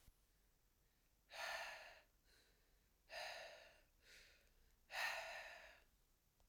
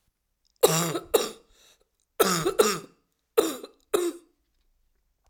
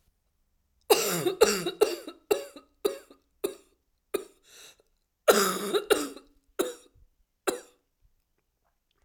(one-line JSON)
{"exhalation_length": "6.5 s", "exhalation_amplitude": 710, "exhalation_signal_mean_std_ratio": 0.48, "three_cough_length": "5.3 s", "three_cough_amplitude": 21794, "three_cough_signal_mean_std_ratio": 0.38, "cough_length": "9.0 s", "cough_amplitude": 20422, "cough_signal_mean_std_ratio": 0.34, "survey_phase": "alpha (2021-03-01 to 2021-08-12)", "age": "45-64", "gender": "Female", "wearing_mask": "No", "symptom_cough_any": true, "symptom_shortness_of_breath": true, "symptom_fatigue": true, "smoker_status": "Never smoked", "respiratory_condition_asthma": false, "respiratory_condition_other": false, "recruitment_source": "Test and Trace", "submission_delay": "2 days", "covid_test_result": "Positive", "covid_test_method": "RT-qPCR", "covid_ct_value": 30.4, "covid_ct_gene": "ORF1ab gene", "covid_ct_mean": 31.0, "covid_viral_load": "68 copies/ml", "covid_viral_load_category": "Minimal viral load (< 10K copies/ml)"}